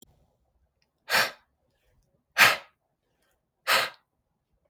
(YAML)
exhalation_length: 4.7 s
exhalation_amplitude: 21591
exhalation_signal_mean_std_ratio: 0.26
survey_phase: beta (2021-08-13 to 2022-03-07)
age: 18-44
gender: Male
wearing_mask: 'No'
symptom_cough_any: true
symptom_runny_or_blocked_nose: true
symptom_shortness_of_breath: true
symptom_fatigue: true
symptom_headache: true
symptom_change_to_sense_of_smell_or_taste: true
symptom_loss_of_taste: true
symptom_onset: 5 days
smoker_status: Never smoked
respiratory_condition_asthma: false
respiratory_condition_other: false
recruitment_source: Test and Trace
submission_delay: 5 days
covid_test_result: Positive
covid_test_method: RT-qPCR
covid_ct_value: 17.6
covid_ct_gene: ORF1ab gene
covid_ct_mean: 18.4
covid_viral_load: 910000 copies/ml
covid_viral_load_category: Low viral load (10K-1M copies/ml)